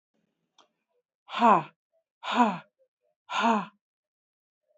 {"exhalation_length": "4.8 s", "exhalation_amplitude": 14701, "exhalation_signal_mean_std_ratio": 0.31, "survey_phase": "beta (2021-08-13 to 2022-03-07)", "age": "45-64", "gender": "Female", "wearing_mask": "No", "symptom_none": true, "smoker_status": "Current smoker (e-cigarettes or vapes only)", "respiratory_condition_asthma": false, "respiratory_condition_other": false, "recruitment_source": "REACT", "submission_delay": "2 days", "covid_test_result": "Negative", "covid_test_method": "RT-qPCR"}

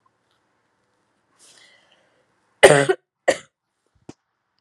{"cough_length": "4.6 s", "cough_amplitude": 32768, "cough_signal_mean_std_ratio": 0.19, "survey_phase": "alpha (2021-03-01 to 2021-08-12)", "age": "18-44", "gender": "Female", "wearing_mask": "No", "symptom_cough_any": true, "symptom_headache": true, "symptom_onset": "3 days", "smoker_status": "Never smoked", "respiratory_condition_asthma": false, "respiratory_condition_other": false, "recruitment_source": "Test and Trace", "submission_delay": "1 day", "covid_test_result": "Positive"}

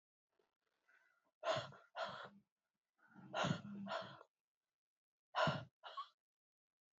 {"exhalation_length": "7.0 s", "exhalation_amplitude": 1988, "exhalation_signal_mean_std_ratio": 0.37, "survey_phase": "beta (2021-08-13 to 2022-03-07)", "age": "45-64", "gender": "Female", "wearing_mask": "No", "symptom_cough_any": true, "symptom_runny_or_blocked_nose": true, "symptom_onset": "4 days", "smoker_status": "Never smoked", "respiratory_condition_asthma": false, "respiratory_condition_other": false, "recruitment_source": "Test and Trace", "submission_delay": "2 days", "covid_test_result": "Positive", "covid_test_method": "RT-qPCR", "covid_ct_value": 17.1, "covid_ct_gene": "ORF1ab gene"}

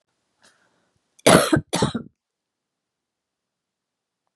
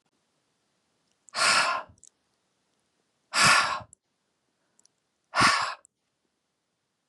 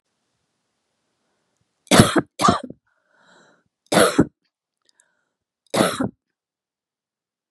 {"cough_length": "4.4 s", "cough_amplitude": 32671, "cough_signal_mean_std_ratio": 0.24, "exhalation_length": "7.1 s", "exhalation_amplitude": 13711, "exhalation_signal_mean_std_ratio": 0.33, "three_cough_length": "7.5 s", "three_cough_amplitude": 32768, "three_cough_signal_mean_std_ratio": 0.27, "survey_phase": "beta (2021-08-13 to 2022-03-07)", "age": "65+", "gender": "Female", "wearing_mask": "No", "symptom_cough_any": true, "smoker_status": "Never smoked", "respiratory_condition_asthma": false, "respiratory_condition_other": false, "recruitment_source": "REACT", "submission_delay": "2 days", "covid_test_result": "Negative", "covid_test_method": "RT-qPCR", "influenza_a_test_result": "Negative", "influenza_b_test_result": "Negative"}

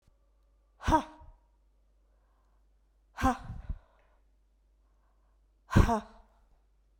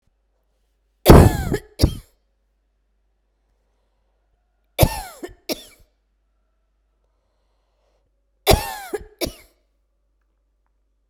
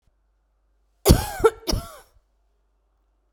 {"exhalation_length": "7.0 s", "exhalation_amplitude": 14070, "exhalation_signal_mean_std_ratio": 0.25, "three_cough_length": "11.1 s", "three_cough_amplitude": 32768, "three_cough_signal_mean_std_ratio": 0.21, "cough_length": "3.3 s", "cough_amplitude": 32768, "cough_signal_mean_std_ratio": 0.26, "survey_phase": "beta (2021-08-13 to 2022-03-07)", "age": "45-64", "gender": "Female", "wearing_mask": "No", "symptom_none": true, "smoker_status": "Never smoked", "respiratory_condition_asthma": true, "respiratory_condition_other": false, "recruitment_source": "REACT", "submission_delay": "2 days", "covid_test_result": "Negative", "covid_test_method": "RT-qPCR"}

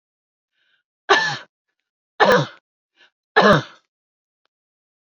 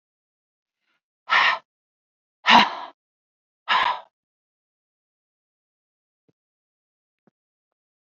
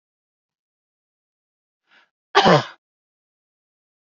{"three_cough_length": "5.1 s", "three_cough_amplitude": 32767, "three_cough_signal_mean_std_ratio": 0.3, "exhalation_length": "8.2 s", "exhalation_amplitude": 29201, "exhalation_signal_mean_std_ratio": 0.23, "cough_length": "4.0 s", "cough_amplitude": 27772, "cough_signal_mean_std_ratio": 0.2, "survey_phase": "beta (2021-08-13 to 2022-03-07)", "age": "45-64", "gender": "Female", "wearing_mask": "No", "symptom_none": true, "smoker_status": "Ex-smoker", "respiratory_condition_asthma": false, "respiratory_condition_other": false, "recruitment_source": "REACT", "submission_delay": "0 days", "covid_test_result": "Negative", "covid_test_method": "RT-qPCR"}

